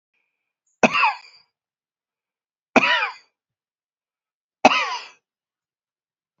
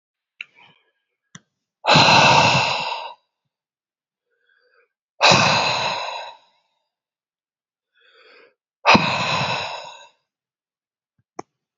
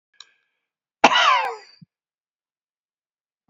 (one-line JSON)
{"three_cough_length": "6.4 s", "three_cough_amplitude": 32767, "three_cough_signal_mean_std_ratio": 0.27, "exhalation_length": "11.8 s", "exhalation_amplitude": 30935, "exhalation_signal_mean_std_ratio": 0.38, "cough_length": "3.5 s", "cough_amplitude": 29265, "cough_signal_mean_std_ratio": 0.28, "survey_phase": "beta (2021-08-13 to 2022-03-07)", "age": "65+", "gender": "Male", "wearing_mask": "No", "symptom_none": true, "smoker_status": "Ex-smoker", "respiratory_condition_asthma": false, "respiratory_condition_other": true, "recruitment_source": "REACT", "submission_delay": "2 days", "covid_test_result": "Negative", "covid_test_method": "RT-qPCR"}